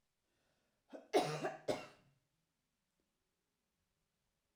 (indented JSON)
{
  "cough_length": "4.6 s",
  "cough_amplitude": 2867,
  "cough_signal_mean_std_ratio": 0.26,
  "survey_phase": "alpha (2021-03-01 to 2021-08-12)",
  "age": "65+",
  "gender": "Female",
  "wearing_mask": "No",
  "symptom_none": true,
  "smoker_status": "Never smoked",
  "respiratory_condition_asthma": false,
  "respiratory_condition_other": false,
  "recruitment_source": "REACT",
  "submission_delay": "1 day",
  "covid_test_result": "Negative",
  "covid_test_method": "RT-qPCR"
}